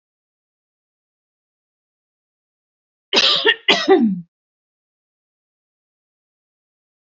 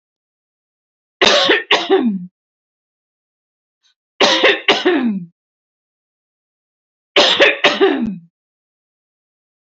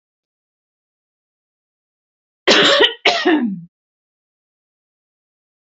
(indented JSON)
{
  "cough_length": "7.2 s",
  "cough_amplitude": 28359,
  "cough_signal_mean_std_ratio": 0.27,
  "three_cough_length": "9.7 s",
  "three_cough_amplitude": 31670,
  "three_cough_signal_mean_std_ratio": 0.42,
  "exhalation_length": "5.6 s",
  "exhalation_amplitude": 30629,
  "exhalation_signal_mean_std_ratio": 0.32,
  "survey_phase": "beta (2021-08-13 to 2022-03-07)",
  "age": "45-64",
  "gender": "Female",
  "wearing_mask": "No",
  "symptom_none": true,
  "smoker_status": "Never smoked",
  "respiratory_condition_asthma": false,
  "respiratory_condition_other": false,
  "recruitment_source": "REACT",
  "submission_delay": "1 day",
  "covid_test_result": "Negative",
  "covid_test_method": "RT-qPCR",
  "influenza_a_test_result": "Negative",
  "influenza_b_test_result": "Negative"
}